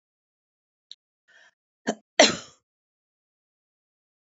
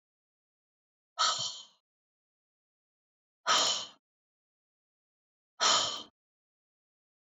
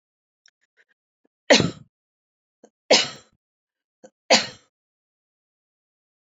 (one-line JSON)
{"cough_length": "4.4 s", "cough_amplitude": 27029, "cough_signal_mean_std_ratio": 0.15, "exhalation_length": "7.3 s", "exhalation_amplitude": 7532, "exhalation_signal_mean_std_ratio": 0.3, "three_cough_length": "6.2 s", "three_cough_amplitude": 26400, "three_cough_signal_mean_std_ratio": 0.21, "survey_phase": "beta (2021-08-13 to 2022-03-07)", "age": "65+", "gender": "Female", "wearing_mask": "No", "symptom_none": true, "smoker_status": "Never smoked", "respiratory_condition_asthma": false, "respiratory_condition_other": false, "recruitment_source": "REACT", "submission_delay": "2 days", "covid_test_result": "Negative", "covid_test_method": "RT-qPCR"}